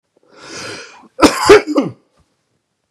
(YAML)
cough_length: 2.9 s
cough_amplitude: 32768
cough_signal_mean_std_ratio: 0.35
survey_phase: beta (2021-08-13 to 2022-03-07)
age: 45-64
gender: Male
wearing_mask: 'No'
symptom_none: true
smoker_status: Never smoked
respiratory_condition_asthma: false
respiratory_condition_other: false
recruitment_source: REACT
submission_delay: 1 day
covid_test_result: Negative
covid_test_method: RT-qPCR
influenza_a_test_result: Negative
influenza_b_test_result: Negative